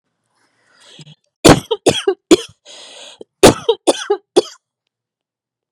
cough_length: 5.7 s
cough_amplitude: 32768
cough_signal_mean_std_ratio: 0.29
survey_phase: beta (2021-08-13 to 2022-03-07)
age: 18-44
gender: Female
wearing_mask: 'No'
symptom_cough_any: true
symptom_runny_or_blocked_nose: true
symptom_fever_high_temperature: true
symptom_onset: 9 days
smoker_status: Never smoked
respiratory_condition_asthma: true
respiratory_condition_other: false
recruitment_source: REACT
submission_delay: 0 days
covid_test_result: Negative
covid_test_method: RT-qPCR
influenza_a_test_result: Unknown/Void
influenza_b_test_result: Unknown/Void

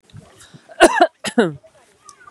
cough_length: 2.3 s
cough_amplitude: 32768
cough_signal_mean_std_ratio: 0.33
survey_phase: beta (2021-08-13 to 2022-03-07)
age: 18-44
gender: Female
wearing_mask: 'No'
symptom_none: true
smoker_status: Ex-smoker
respiratory_condition_asthma: false
respiratory_condition_other: false
recruitment_source: REACT
submission_delay: 1 day
covid_test_result: Negative
covid_test_method: RT-qPCR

